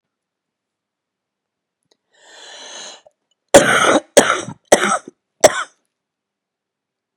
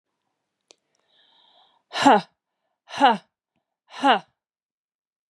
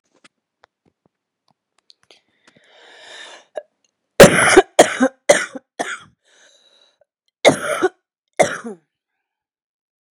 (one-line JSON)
{"cough_length": "7.2 s", "cough_amplitude": 32768, "cough_signal_mean_std_ratio": 0.28, "exhalation_length": "5.3 s", "exhalation_amplitude": 24420, "exhalation_signal_mean_std_ratio": 0.26, "three_cough_length": "10.2 s", "three_cough_amplitude": 32768, "three_cough_signal_mean_std_ratio": 0.25, "survey_phase": "beta (2021-08-13 to 2022-03-07)", "age": "18-44", "gender": "Female", "wearing_mask": "No", "symptom_cough_any": true, "symptom_new_continuous_cough": true, "symptom_runny_or_blocked_nose": true, "symptom_fatigue": true, "symptom_fever_high_temperature": true, "symptom_headache": true, "symptom_change_to_sense_of_smell_or_taste": true, "smoker_status": "Ex-smoker", "respiratory_condition_asthma": false, "respiratory_condition_other": false, "recruitment_source": "Test and Trace", "submission_delay": "2 days", "covid_test_result": "Positive", "covid_test_method": "RT-qPCR", "covid_ct_value": 14.8, "covid_ct_gene": "ORF1ab gene", "covid_ct_mean": 15.1, "covid_viral_load": "11000000 copies/ml", "covid_viral_load_category": "High viral load (>1M copies/ml)"}